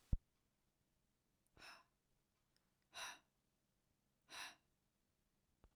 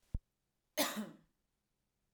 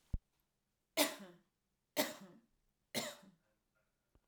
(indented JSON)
{
  "exhalation_length": "5.8 s",
  "exhalation_amplitude": 1948,
  "exhalation_signal_mean_std_ratio": 0.18,
  "cough_length": "2.1 s",
  "cough_amplitude": 3928,
  "cough_signal_mean_std_ratio": 0.3,
  "three_cough_length": "4.3 s",
  "three_cough_amplitude": 4161,
  "three_cough_signal_mean_std_ratio": 0.27,
  "survey_phase": "alpha (2021-03-01 to 2021-08-12)",
  "age": "18-44",
  "gender": "Female",
  "wearing_mask": "No",
  "symptom_fatigue": true,
  "smoker_status": "Never smoked",
  "respiratory_condition_asthma": false,
  "respiratory_condition_other": false,
  "recruitment_source": "REACT",
  "submission_delay": "1 day",
  "covid_test_result": "Negative",
  "covid_test_method": "RT-qPCR"
}